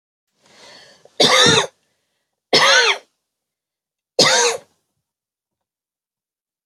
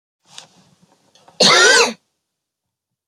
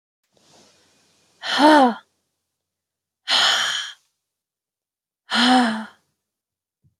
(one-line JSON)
{"three_cough_length": "6.7 s", "three_cough_amplitude": 32051, "three_cough_signal_mean_std_ratio": 0.36, "cough_length": "3.1 s", "cough_amplitude": 31750, "cough_signal_mean_std_ratio": 0.34, "exhalation_length": "7.0 s", "exhalation_amplitude": 25122, "exhalation_signal_mean_std_ratio": 0.36, "survey_phase": "beta (2021-08-13 to 2022-03-07)", "age": "18-44", "gender": "Female", "wearing_mask": "No", "symptom_runny_or_blocked_nose": true, "symptom_headache": true, "symptom_onset": "11 days", "smoker_status": "Never smoked", "respiratory_condition_asthma": false, "respiratory_condition_other": false, "recruitment_source": "REACT", "submission_delay": "1 day", "covid_test_result": "Negative", "covid_test_method": "RT-qPCR", "influenza_a_test_result": "Negative", "influenza_b_test_result": "Negative"}